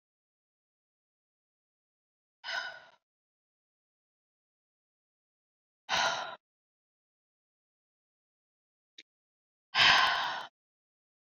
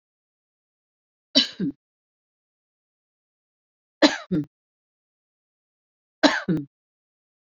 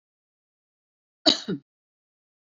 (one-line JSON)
{"exhalation_length": "11.3 s", "exhalation_amplitude": 12443, "exhalation_signal_mean_std_ratio": 0.23, "three_cough_length": "7.4 s", "three_cough_amplitude": 28763, "three_cough_signal_mean_std_ratio": 0.23, "cough_length": "2.5 s", "cough_amplitude": 26235, "cough_signal_mean_std_ratio": 0.18, "survey_phase": "beta (2021-08-13 to 2022-03-07)", "age": "45-64", "gender": "Female", "wearing_mask": "No", "symptom_none": true, "smoker_status": "Never smoked", "respiratory_condition_asthma": false, "respiratory_condition_other": false, "recruitment_source": "REACT", "submission_delay": "5 days", "covid_test_result": "Negative", "covid_test_method": "RT-qPCR"}